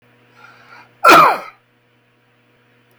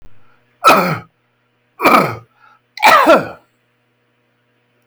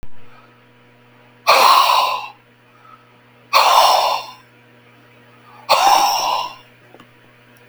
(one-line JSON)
{"cough_length": "3.0 s", "cough_amplitude": 32768, "cough_signal_mean_std_ratio": 0.29, "three_cough_length": "4.9 s", "three_cough_amplitude": 32768, "three_cough_signal_mean_std_ratio": 0.39, "exhalation_length": "7.7 s", "exhalation_amplitude": 32768, "exhalation_signal_mean_std_ratio": 0.48, "survey_phase": "beta (2021-08-13 to 2022-03-07)", "age": "65+", "gender": "Male", "wearing_mask": "No", "symptom_none": true, "smoker_status": "Ex-smoker", "respiratory_condition_asthma": false, "respiratory_condition_other": false, "recruitment_source": "REACT", "submission_delay": "2 days", "covid_test_result": "Negative", "covid_test_method": "RT-qPCR", "influenza_a_test_result": "Negative", "influenza_b_test_result": "Negative"}